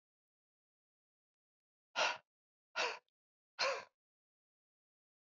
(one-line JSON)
{"exhalation_length": "5.2 s", "exhalation_amplitude": 2548, "exhalation_signal_mean_std_ratio": 0.26, "survey_phase": "beta (2021-08-13 to 2022-03-07)", "age": "45-64", "gender": "Female", "wearing_mask": "No", "symptom_none": true, "smoker_status": "Never smoked", "respiratory_condition_asthma": false, "respiratory_condition_other": false, "recruitment_source": "REACT", "submission_delay": "2 days", "covid_test_result": "Negative", "covid_test_method": "RT-qPCR", "influenza_a_test_result": "Negative", "influenza_b_test_result": "Negative"}